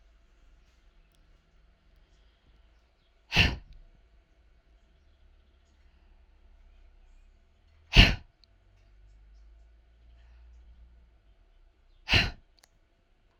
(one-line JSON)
{"exhalation_length": "13.4 s", "exhalation_amplitude": 25841, "exhalation_signal_mean_std_ratio": 0.19, "survey_phase": "alpha (2021-03-01 to 2021-08-12)", "age": "18-44", "gender": "Female", "wearing_mask": "No", "symptom_none": true, "smoker_status": "Ex-smoker", "respiratory_condition_asthma": true, "respiratory_condition_other": false, "recruitment_source": "REACT", "submission_delay": "1 day", "covid_test_result": "Negative", "covid_test_method": "RT-qPCR"}